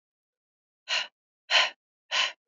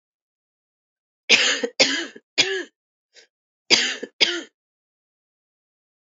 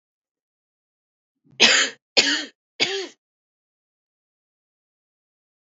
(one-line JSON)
{"exhalation_length": "2.5 s", "exhalation_amplitude": 12739, "exhalation_signal_mean_std_ratio": 0.35, "cough_length": "6.1 s", "cough_amplitude": 31520, "cough_signal_mean_std_ratio": 0.33, "three_cough_length": "5.7 s", "three_cough_amplitude": 31590, "three_cough_signal_mean_std_ratio": 0.26, "survey_phase": "beta (2021-08-13 to 2022-03-07)", "age": "18-44", "gender": "Female", "wearing_mask": "No", "symptom_cough_any": true, "symptom_runny_or_blocked_nose": true, "symptom_sore_throat": true, "symptom_fatigue": true, "symptom_headache": true, "symptom_change_to_sense_of_smell_or_taste": true, "smoker_status": "Ex-smoker", "respiratory_condition_asthma": false, "respiratory_condition_other": false, "recruitment_source": "Test and Trace", "submission_delay": "2 days", "covid_test_method": "RT-qPCR", "covid_ct_value": 20.9, "covid_ct_gene": "ORF1ab gene"}